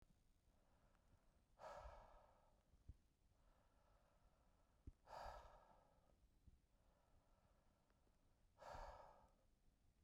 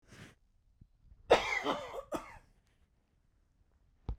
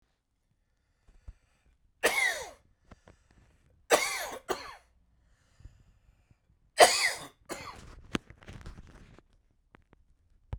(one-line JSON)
{"exhalation_length": "10.0 s", "exhalation_amplitude": 208, "exhalation_signal_mean_std_ratio": 0.54, "cough_length": "4.2 s", "cough_amplitude": 8341, "cough_signal_mean_std_ratio": 0.3, "three_cough_length": "10.6 s", "three_cough_amplitude": 21476, "three_cough_signal_mean_std_ratio": 0.26, "survey_phase": "beta (2021-08-13 to 2022-03-07)", "age": "45-64", "gender": "Male", "wearing_mask": "No", "symptom_cough_any": true, "smoker_status": "Ex-smoker", "respiratory_condition_asthma": false, "respiratory_condition_other": false, "recruitment_source": "REACT", "submission_delay": "3 days", "covid_test_result": "Negative", "covid_test_method": "RT-qPCR", "influenza_a_test_result": "Negative", "influenza_b_test_result": "Negative"}